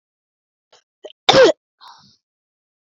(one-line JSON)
{"cough_length": "2.8 s", "cough_amplitude": 32767, "cough_signal_mean_std_ratio": 0.24, "survey_phase": "beta (2021-08-13 to 2022-03-07)", "age": "18-44", "gender": "Female", "wearing_mask": "No", "symptom_none": true, "smoker_status": "Never smoked", "respiratory_condition_asthma": false, "respiratory_condition_other": false, "recruitment_source": "REACT", "submission_delay": "3 days", "covid_test_result": "Negative", "covid_test_method": "RT-qPCR"}